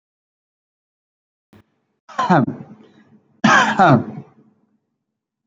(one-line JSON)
{"three_cough_length": "5.5 s", "three_cough_amplitude": 28977, "three_cough_signal_mean_std_ratio": 0.32, "survey_phase": "beta (2021-08-13 to 2022-03-07)", "age": "18-44", "gender": "Male", "wearing_mask": "Yes", "symptom_none": true, "smoker_status": "Never smoked", "respiratory_condition_asthma": false, "respiratory_condition_other": false, "recruitment_source": "REACT", "submission_delay": "3 days", "covid_test_result": "Negative", "covid_test_method": "RT-qPCR"}